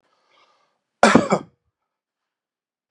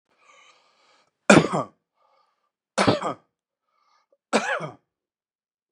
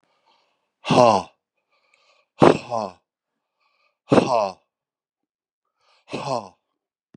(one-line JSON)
{"cough_length": "2.9 s", "cough_amplitude": 32767, "cough_signal_mean_std_ratio": 0.23, "three_cough_length": "5.7 s", "three_cough_amplitude": 31784, "three_cough_signal_mean_std_ratio": 0.26, "exhalation_length": "7.2 s", "exhalation_amplitude": 32768, "exhalation_signal_mean_std_ratio": 0.28, "survey_phase": "beta (2021-08-13 to 2022-03-07)", "age": "45-64", "gender": "Male", "wearing_mask": "No", "symptom_none": true, "smoker_status": "Ex-smoker", "respiratory_condition_asthma": false, "respiratory_condition_other": false, "recruitment_source": "REACT", "submission_delay": "0 days", "covid_test_result": "Negative", "covid_test_method": "RT-qPCR", "influenza_a_test_result": "Negative", "influenza_b_test_result": "Negative"}